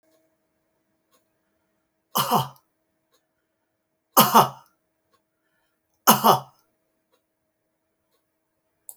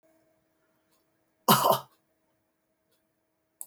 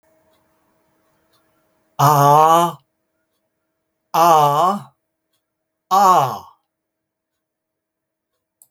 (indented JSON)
{
  "three_cough_length": "9.0 s",
  "three_cough_amplitude": 32767,
  "three_cough_signal_mean_std_ratio": 0.22,
  "cough_length": "3.7 s",
  "cough_amplitude": 18463,
  "cough_signal_mean_std_ratio": 0.22,
  "exhalation_length": "8.7 s",
  "exhalation_amplitude": 30511,
  "exhalation_signal_mean_std_ratio": 0.37,
  "survey_phase": "beta (2021-08-13 to 2022-03-07)",
  "age": "65+",
  "gender": "Male",
  "wearing_mask": "No",
  "symptom_shortness_of_breath": true,
  "symptom_fatigue": true,
  "smoker_status": "Ex-smoker",
  "respiratory_condition_asthma": false,
  "respiratory_condition_other": false,
  "recruitment_source": "REACT",
  "submission_delay": "8 days",
  "covid_test_result": "Negative",
  "covid_test_method": "RT-qPCR"
}